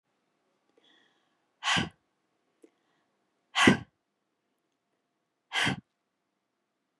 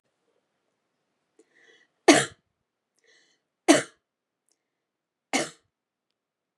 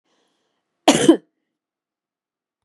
exhalation_length: 7.0 s
exhalation_amplitude: 19682
exhalation_signal_mean_std_ratio: 0.22
three_cough_length: 6.6 s
three_cough_amplitude: 27436
three_cough_signal_mean_std_ratio: 0.18
cough_length: 2.6 s
cough_amplitude: 32540
cough_signal_mean_std_ratio: 0.23
survey_phase: beta (2021-08-13 to 2022-03-07)
age: 45-64
gender: Female
wearing_mask: 'No'
symptom_none: true
smoker_status: Never smoked
respiratory_condition_asthma: false
respiratory_condition_other: false
recruitment_source: REACT
submission_delay: 2 days
covid_test_result: Negative
covid_test_method: RT-qPCR
influenza_a_test_result: Negative
influenza_b_test_result: Negative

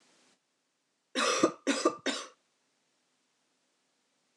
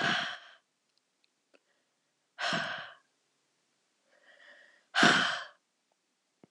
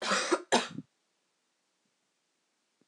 three_cough_length: 4.4 s
three_cough_amplitude: 9645
three_cough_signal_mean_std_ratio: 0.32
exhalation_length: 6.5 s
exhalation_amplitude: 11472
exhalation_signal_mean_std_ratio: 0.32
cough_length: 2.9 s
cough_amplitude: 8244
cough_signal_mean_std_ratio: 0.33
survey_phase: alpha (2021-03-01 to 2021-08-12)
age: 18-44
gender: Female
wearing_mask: 'No'
symptom_cough_any: true
symptom_fatigue: true
symptom_fever_high_temperature: true
symptom_headache: true
smoker_status: Never smoked
respiratory_condition_asthma: false
respiratory_condition_other: false
recruitment_source: Test and Trace
submission_delay: 2 days
covid_test_result: Positive
covid_test_method: RT-qPCR
covid_ct_value: 23.2
covid_ct_gene: ORF1ab gene
covid_ct_mean: 24.6
covid_viral_load: 8900 copies/ml
covid_viral_load_category: Minimal viral load (< 10K copies/ml)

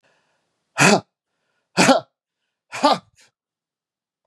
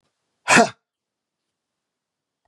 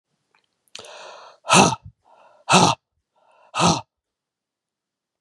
three_cough_length: 4.3 s
three_cough_amplitude: 31067
three_cough_signal_mean_std_ratio: 0.29
cough_length: 2.5 s
cough_amplitude: 31202
cough_signal_mean_std_ratio: 0.21
exhalation_length: 5.2 s
exhalation_amplitude: 32767
exhalation_signal_mean_std_ratio: 0.3
survey_phase: beta (2021-08-13 to 2022-03-07)
age: 65+
gender: Male
wearing_mask: 'No'
symptom_change_to_sense_of_smell_or_taste: true
smoker_status: Never smoked
respiratory_condition_asthma: false
respiratory_condition_other: false
recruitment_source: REACT
submission_delay: 2 days
covid_test_result: Negative
covid_test_method: RT-qPCR
influenza_a_test_result: Negative
influenza_b_test_result: Negative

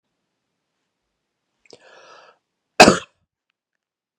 cough_length: 4.2 s
cough_amplitude: 32768
cough_signal_mean_std_ratio: 0.15
survey_phase: beta (2021-08-13 to 2022-03-07)
age: 45-64
gender: Male
wearing_mask: 'No'
symptom_none: true
smoker_status: Ex-smoker
respiratory_condition_asthma: false
respiratory_condition_other: false
recruitment_source: REACT
submission_delay: 0 days
covid_test_result: Negative
covid_test_method: RT-qPCR
influenza_a_test_result: Negative
influenza_b_test_result: Negative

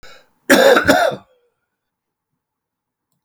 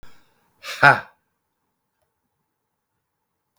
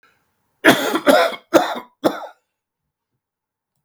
cough_length: 3.2 s
cough_amplitude: 32768
cough_signal_mean_std_ratio: 0.36
exhalation_length: 3.6 s
exhalation_amplitude: 32768
exhalation_signal_mean_std_ratio: 0.17
three_cough_length: 3.8 s
three_cough_amplitude: 32768
three_cough_signal_mean_std_ratio: 0.36
survey_phase: beta (2021-08-13 to 2022-03-07)
age: 65+
gender: Male
wearing_mask: 'No'
symptom_none: true
smoker_status: Ex-smoker
respiratory_condition_asthma: false
respiratory_condition_other: true
recruitment_source: REACT
submission_delay: 1 day
covid_test_result: Negative
covid_test_method: RT-qPCR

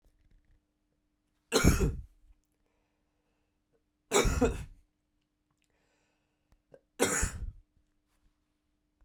three_cough_length: 9.0 s
three_cough_amplitude: 12051
three_cough_signal_mean_std_ratio: 0.29
survey_phase: beta (2021-08-13 to 2022-03-07)
age: 18-44
gender: Male
wearing_mask: 'No'
symptom_cough_any: true
symptom_runny_or_blocked_nose: true
symptom_onset: 5 days
smoker_status: Never smoked
respiratory_condition_asthma: false
respiratory_condition_other: false
recruitment_source: REACT
submission_delay: 1 day
covid_test_result: Negative
covid_test_method: RT-qPCR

